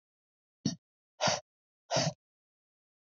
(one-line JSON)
{"exhalation_length": "3.1 s", "exhalation_amplitude": 5541, "exhalation_signal_mean_std_ratio": 0.3, "survey_phase": "beta (2021-08-13 to 2022-03-07)", "age": "18-44", "gender": "Female", "wearing_mask": "No", "symptom_none": true, "smoker_status": "Never smoked", "respiratory_condition_asthma": false, "respiratory_condition_other": false, "recruitment_source": "REACT", "submission_delay": "1 day", "covid_test_result": "Negative", "covid_test_method": "RT-qPCR"}